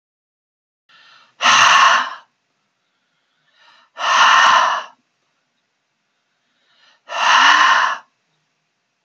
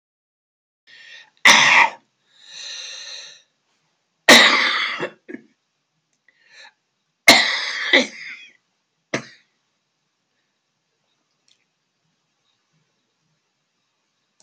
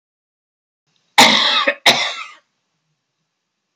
{"exhalation_length": "9.0 s", "exhalation_amplitude": 32767, "exhalation_signal_mean_std_ratio": 0.42, "three_cough_length": "14.4 s", "three_cough_amplitude": 32544, "three_cough_signal_mean_std_ratio": 0.27, "cough_length": "3.8 s", "cough_amplitude": 32068, "cough_signal_mean_std_ratio": 0.36, "survey_phase": "beta (2021-08-13 to 2022-03-07)", "age": "65+", "gender": "Male", "wearing_mask": "No", "symptom_cough_any": true, "symptom_sore_throat": true, "smoker_status": "Never smoked", "respiratory_condition_asthma": false, "respiratory_condition_other": false, "recruitment_source": "REACT", "submission_delay": "14 days", "covid_test_result": "Negative", "covid_test_method": "RT-qPCR"}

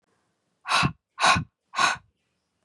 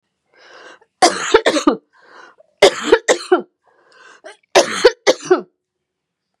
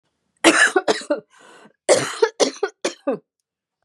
{"exhalation_length": "2.6 s", "exhalation_amplitude": 16824, "exhalation_signal_mean_std_ratio": 0.4, "three_cough_length": "6.4 s", "three_cough_amplitude": 32768, "three_cough_signal_mean_std_ratio": 0.36, "cough_length": "3.8 s", "cough_amplitude": 32767, "cough_signal_mean_std_ratio": 0.41, "survey_phase": "beta (2021-08-13 to 2022-03-07)", "age": "45-64", "gender": "Female", "wearing_mask": "No", "symptom_none": true, "smoker_status": "Never smoked", "respiratory_condition_asthma": false, "respiratory_condition_other": false, "recruitment_source": "REACT", "submission_delay": "1 day", "covid_test_result": "Negative", "covid_test_method": "RT-qPCR", "influenza_a_test_result": "Negative", "influenza_b_test_result": "Negative"}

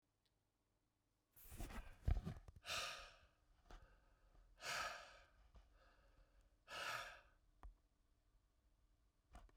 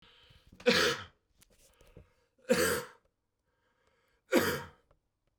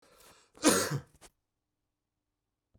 {"exhalation_length": "9.6 s", "exhalation_amplitude": 1358, "exhalation_signal_mean_std_ratio": 0.39, "three_cough_length": "5.4 s", "three_cough_amplitude": 8865, "three_cough_signal_mean_std_ratio": 0.34, "cough_length": "2.8 s", "cough_amplitude": 10247, "cough_signal_mean_std_ratio": 0.27, "survey_phase": "beta (2021-08-13 to 2022-03-07)", "age": "45-64", "gender": "Male", "wearing_mask": "No", "symptom_none": true, "smoker_status": "Never smoked", "respiratory_condition_asthma": false, "respiratory_condition_other": false, "recruitment_source": "REACT", "submission_delay": "1 day", "covid_test_result": "Negative", "covid_test_method": "RT-qPCR"}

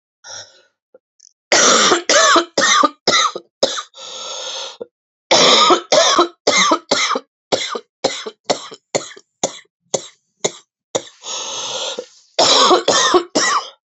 {"cough_length": "14.0 s", "cough_amplitude": 32768, "cough_signal_mean_std_ratio": 0.53, "survey_phase": "beta (2021-08-13 to 2022-03-07)", "age": "45-64", "gender": "Female", "wearing_mask": "No", "symptom_new_continuous_cough": true, "symptom_runny_or_blocked_nose": true, "symptom_headache": true, "symptom_onset": "3 days", "smoker_status": "Never smoked", "respiratory_condition_asthma": false, "respiratory_condition_other": false, "recruitment_source": "Test and Trace", "submission_delay": "2 days", "covid_test_result": "Positive", "covid_test_method": "RT-qPCR", "covid_ct_value": 13.6, "covid_ct_gene": "S gene", "covid_ct_mean": 14.0, "covid_viral_load": "26000000 copies/ml", "covid_viral_load_category": "High viral load (>1M copies/ml)"}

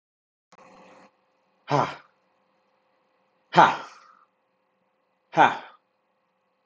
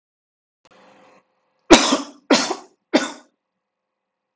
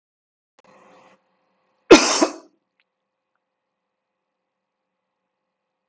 {"exhalation_length": "6.7 s", "exhalation_amplitude": 28268, "exhalation_signal_mean_std_ratio": 0.22, "three_cough_length": "4.4 s", "three_cough_amplitude": 32768, "three_cough_signal_mean_std_ratio": 0.26, "cough_length": "5.9 s", "cough_amplitude": 32768, "cough_signal_mean_std_ratio": 0.16, "survey_phase": "alpha (2021-03-01 to 2021-08-12)", "age": "45-64", "gender": "Male", "wearing_mask": "No", "symptom_none": true, "smoker_status": "Never smoked", "respiratory_condition_asthma": false, "respiratory_condition_other": false, "recruitment_source": "REACT", "submission_delay": "1 day", "covid_test_result": "Negative", "covid_test_method": "RT-qPCR"}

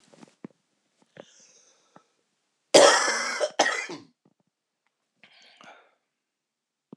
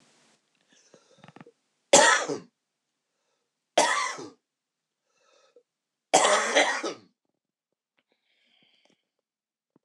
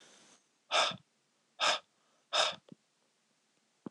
{"cough_length": "7.0 s", "cough_amplitude": 26027, "cough_signal_mean_std_ratio": 0.26, "three_cough_length": "9.8 s", "three_cough_amplitude": 21344, "three_cough_signal_mean_std_ratio": 0.29, "exhalation_length": "3.9 s", "exhalation_amplitude": 5338, "exhalation_signal_mean_std_ratio": 0.32, "survey_phase": "alpha (2021-03-01 to 2021-08-12)", "age": "45-64", "gender": "Male", "wearing_mask": "No", "symptom_cough_any": true, "symptom_abdominal_pain": true, "symptom_fatigue": true, "symptom_fever_high_temperature": true, "symptom_headache": true, "smoker_status": "Never smoked", "respiratory_condition_asthma": false, "respiratory_condition_other": false, "recruitment_source": "Test and Trace", "submission_delay": "1 day", "covid_test_result": "Positive", "covid_test_method": "RT-qPCR", "covid_ct_value": 31.3, "covid_ct_gene": "N gene"}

